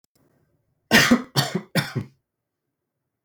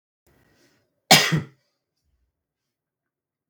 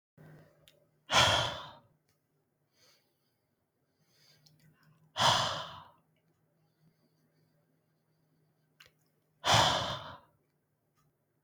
{"three_cough_length": "3.2 s", "three_cough_amplitude": 30708, "three_cough_signal_mean_std_ratio": 0.33, "cough_length": "3.5 s", "cough_amplitude": 32768, "cough_signal_mean_std_ratio": 0.2, "exhalation_length": "11.4 s", "exhalation_amplitude": 9548, "exhalation_signal_mean_std_ratio": 0.28, "survey_phase": "beta (2021-08-13 to 2022-03-07)", "age": "18-44", "gender": "Male", "wearing_mask": "No", "symptom_cough_any": true, "symptom_runny_or_blocked_nose": true, "symptom_sore_throat": true, "symptom_fatigue": true, "symptom_headache": true, "symptom_onset": "4 days", "smoker_status": "Never smoked", "respiratory_condition_asthma": false, "respiratory_condition_other": false, "recruitment_source": "Test and Trace", "submission_delay": "2 days", "covid_test_result": "Positive", "covid_test_method": "RT-qPCR", "covid_ct_value": 22.7, "covid_ct_gene": "ORF1ab gene"}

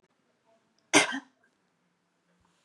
{"cough_length": "2.6 s", "cough_amplitude": 20957, "cough_signal_mean_std_ratio": 0.2, "survey_phase": "beta (2021-08-13 to 2022-03-07)", "age": "18-44", "gender": "Female", "wearing_mask": "No", "symptom_none": true, "smoker_status": "Never smoked", "respiratory_condition_asthma": false, "respiratory_condition_other": false, "recruitment_source": "REACT", "submission_delay": "1 day", "covid_test_result": "Negative", "covid_test_method": "RT-qPCR", "influenza_a_test_result": "Negative", "influenza_b_test_result": "Negative"}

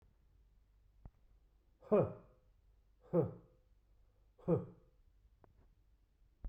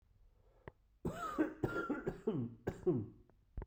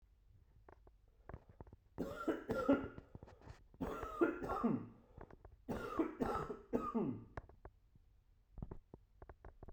{"exhalation_length": "6.5 s", "exhalation_amplitude": 3019, "exhalation_signal_mean_std_ratio": 0.27, "cough_length": "3.7 s", "cough_amplitude": 2319, "cough_signal_mean_std_ratio": 0.55, "three_cough_length": "9.7 s", "three_cough_amplitude": 2973, "three_cough_signal_mean_std_ratio": 0.49, "survey_phase": "beta (2021-08-13 to 2022-03-07)", "age": "45-64", "gender": "Male", "wearing_mask": "No", "symptom_cough_any": true, "symptom_runny_or_blocked_nose": true, "symptom_shortness_of_breath": true, "symptom_fatigue": true, "symptom_headache": true, "symptom_onset": "2 days", "smoker_status": "Ex-smoker", "respiratory_condition_asthma": false, "respiratory_condition_other": false, "recruitment_source": "Test and Trace", "submission_delay": "1 day", "covid_test_result": "Positive", "covid_test_method": "RT-qPCR", "covid_ct_value": 23.3, "covid_ct_gene": "N gene"}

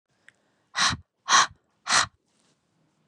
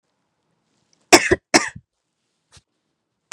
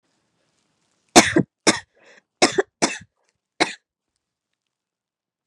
{"exhalation_length": "3.1 s", "exhalation_amplitude": 17680, "exhalation_signal_mean_std_ratio": 0.33, "cough_length": "3.3 s", "cough_amplitude": 32768, "cough_signal_mean_std_ratio": 0.2, "three_cough_length": "5.5 s", "three_cough_amplitude": 32768, "three_cough_signal_mean_std_ratio": 0.23, "survey_phase": "beta (2021-08-13 to 2022-03-07)", "age": "18-44", "gender": "Female", "wearing_mask": "No", "symptom_cough_any": true, "symptom_runny_or_blocked_nose": true, "symptom_shortness_of_breath": true, "symptom_sore_throat": true, "symptom_abdominal_pain": true, "symptom_fatigue": true, "symptom_fever_high_temperature": true, "symptom_headache": true, "symptom_loss_of_taste": true, "symptom_other": true, "symptom_onset": "5 days", "smoker_status": "Never smoked", "respiratory_condition_asthma": false, "respiratory_condition_other": false, "recruitment_source": "Test and Trace", "submission_delay": "3 days", "covid_test_result": "Positive", "covid_test_method": "RT-qPCR", "covid_ct_value": 16.2, "covid_ct_gene": "ORF1ab gene", "covid_ct_mean": 16.3, "covid_viral_load": "4500000 copies/ml", "covid_viral_load_category": "High viral load (>1M copies/ml)"}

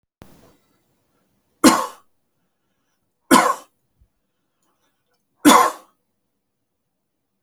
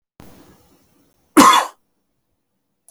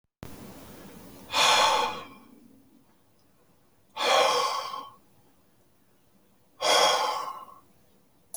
{"three_cough_length": "7.4 s", "three_cough_amplitude": 32768, "three_cough_signal_mean_std_ratio": 0.24, "cough_length": "2.9 s", "cough_amplitude": 32767, "cough_signal_mean_std_ratio": 0.26, "exhalation_length": "8.4 s", "exhalation_amplitude": 11759, "exhalation_signal_mean_std_ratio": 0.44, "survey_phase": "alpha (2021-03-01 to 2021-08-12)", "age": "18-44", "gender": "Male", "wearing_mask": "No", "symptom_none": true, "smoker_status": "Ex-smoker", "respiratory_condition_asthma": false, "respiratory_condition_other": false, "recruitment_source": "REACT", "submission_delay": "1 day", "covid_test_result": "Negative", "covid_test_method": "RT-qPCR"}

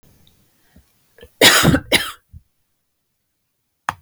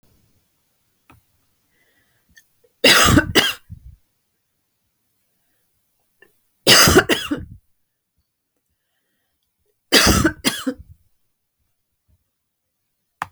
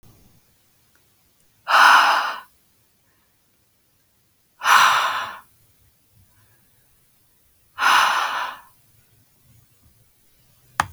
{"cough_length": "4.0 s", "cough_amplitude": 32768, "cough_signal_mean_std_ratio": 0.29, "three_cough_length": "13.3 s", "three_cough_amplitude": 32768, "three_cough_signal_mean_std_ratio": 0.28, "exhalation_length": "10.9 s", "exhalation_amplitude": 28457, "exhalation_signal_mean_std_ratio": 0.33, "survey_phase": "beta (2021-08-13 to 2022-03-07)", "age": "45-64", "gender": "Female", "wearing_mask": "No", "symptom_none": true, "smoker_status": "Never smoked", "respiratory_condition_asthma": true, "respiratory_condition_other": false, "recruitment_source": "REACT", "submission_delay": "2 days", "covid_test_result": "Negative", "covid_test_method": "RT-qPCR"}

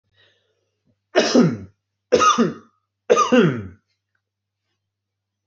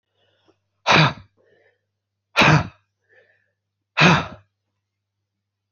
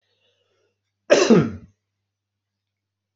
{"three_cough_length": "5.5 s", "three_cough_amplitude": 26411, "three_cough_signal_mean_std_ratio": 0.38, "exhalation_length": "5.7 s", "exhalation_amplitude": 25999, "exhalation_signal_mean_std_ratio": 0.3, "cough_length": "3.2 s", "cough_amplitude": 26335, "cough_signal_mean_std_ratio": 0.27, "survey_phase": "beta (2021-08-13 to 2022-03-07)", "age": "18-44", "gender": "Male", "wearing_mask": "No", "symptom_none": true, "smoker_status": "Never smoked", "respiratory_condition_asthma": false, "respiratory_condition_other": false, "recruitment_source": "REACT", "submission_delay": "1 day", "covid_test_result": "Negative", "covid_test_method": "RT-qPCR", "influenza_a_test_result": "Unknown/Void", "influenza_b_test_result": "Unknown/Void"}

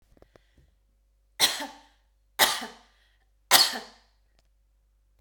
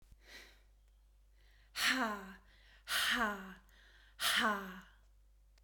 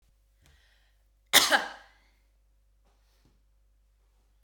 {"three_cough_length": "5.2 s", "three_cough_amplitude": 22064, "three_cough_signal_mean_std_ratio": 0.27, "exhalation_length": "5.6 s", "exhalation_amplitude": 4446, "exhalation_signal_mean_std_ratio": 0.48, "cough_length": "4.4 s", "cough_amplitude": 22047, "cough_signal_mean_std_ratio": 0.2, "survey_phase": "beta (2021-08-13 to 2022-03-07)", "age": "45-64", "gender": "Female", "wearing_mask": "No", "symptom_none": true, "smoker_status": "Never smoked", "respiratory_condition_asthma": false, "respiratory_condition_other": false, "recruitment_source": "REACT", "submission_delay": "1 day", "covid_test_result": "Negative", "covid_test_method": "RT-qPCR"}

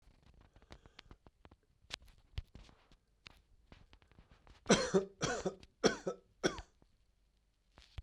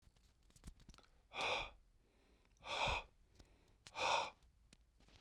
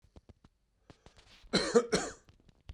{"three_cough_length": "8.0 s", "three_cough_amplitude": 6976, "three_cough_signal_mean_std_ratio": 0.28, "exhalation_length": "5.2 s", "exhalation_amplitude": 1776, "exhalation_signal_mean_std_ratio": 0.41, "cough_length": "2.7 s", "cough_amplitude": 7806, "cough_signal_mean_std_ratio": 0.32, "survey_phase": "beta (2021-08-13 to 2022-03-07)", "age": "45-64", "gender": "Male", "wearing_mask": "No", "symptom_none": true, "smoker_status": "Ex-smoker", "respiratory_condition_asthma": false, "respiratory_condition_other": false, "recruitment_source": "REACT", "submission_delay": "1 day", "covid_test_result": "Negative", "covid_test_method": "RT-qPCR", "influenza_a_test_result": "Negative", "influenza_b_test_result": "Negative"}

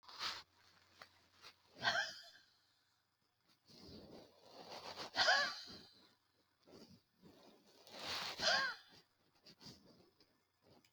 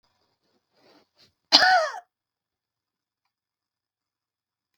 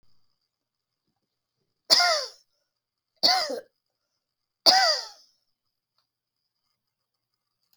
{"exhalation_length": "10.9 s", "exhalation_amplitude": 2882, "exhalation_signal_mean_std_ratio": 0.36, "cough_length": "4.8 s", "cough_amplitude": 32768, "cough_signal_mean_std_ratio": 0.22, "three_cough_length": "7.8 s", "three_cough_amplitude": 24193, "three_cough_signal_mean_std_ratio": 0.27, "survey_phase": "beta (2021-08-13 to 2022-03-07)", "age": "65+", "gender": "Female", "wearing_mask": "No", "symptom_none": true, "smoker_status": "Never smoked", "respiratory_condition_asthma": false, "respiratory_condition_other": false, "recruitment_source": "REACT", "submission_delay": "2 days", "covid_test_result": "Negative", "covid_test_method": "RT-qPCR", "influenza_a_test_result": "Negative", "influenza_b_test_result": "Negative"}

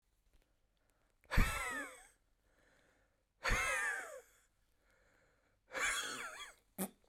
{"exhalation_length": "7.1 s", "exhalation_amplitude": 4180, "exhalation_signal_mean_std_ratio": 0.39, "survey_phase": "beta (2021-08-13 to 2022-03-07)", "age": "45-64", "gender": "Female", "wearing_mask": "No", "symptom_none": true, "smoker_status": "Never smoked", "respiratory_condition_asthma": false, "respiratory_condition_other": true, "recruitment_source": "REACT", "submission_delay": "1 day", "covid_test_result": "Negative", "covid_test_method": "RT-qPCR", "influenza_a_test_result": "Unknown/Void", "influenza_b_test_result": "Unknown/Void"}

